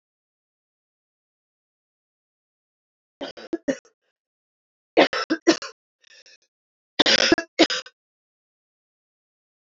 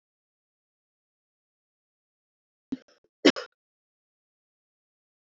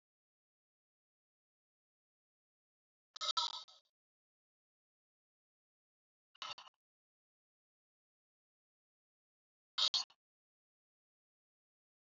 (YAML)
three_cough_length: 9.7 s
three_cough_amplitude: 29063
three_cough_signal_mean_std_ratio: 0.23
cough_length: 5.2 s
cough_amplitude: 20897
cough_signal_mean_std_ratio: 0.1
exhalation_length: 12.1 s
exhalation_amplitude: 3320
exhalation_signal_mean_std_ratio: 0.16
survey_phase: beta (2021-08-13 to 2022-03-07)
age: 45-64
gender: Female
wearing_mask: 'No'
symptom_cough_any: true
symptom_runny_or_blocked_nose: true
symptom_abdominal_pain: true
symptom_other: true
symptom_onset: 5 days
smoker_status: Never smoked
recruitment_source: Test and Trace
submission_delay: 2 days
covid_test_result: Positive
covid_test_method: RT-qPCR
covid_ct_value: 23.0
covid_ct_gene: ORF1ab gene
covid_ct_mean: 23.8
covid_viral_load: 16000 copies/ml
covid_viral_load_category: Low viral load (10K-1M copies/ml)